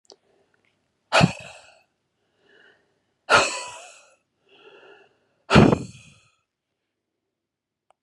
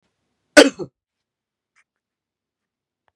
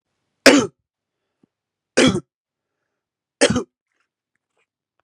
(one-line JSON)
{"exhalation_length": "8.0 s", "exhalation_amplitude": 31868, "exhalation_signal_mean_std_ratio": 0.23, "cough_length": "3.2 s", "cough_amplitude": 32768, "cough_signal_mean_std_ratio": 0.15, "three_cough_length": "5.0 s", "three_cough_amplitude": 32768, "three_cough_signal_mean_std_ratio": 0.25, "survey_phase": "beta (2021-08-13 to 2022-03-07)", "age": "45-64", "gender": "Male", "wearing_mask": "No", "symptom_sore_throat": true, "symptom_headache": true, "symptom_onset": "3 days", "smoker_status": "Never smoked", "respiratory_condition_asthma": false, "respiratory_condition_other": false, "recruitment_source": "Test and Trace", "submission_delay": "2 days", "covid_test_result": "Positive", "covid_test_method": "RT-qPCR", "covid_ct_value": 25.7, "covid_ct_gene": "ORF1ab gene"}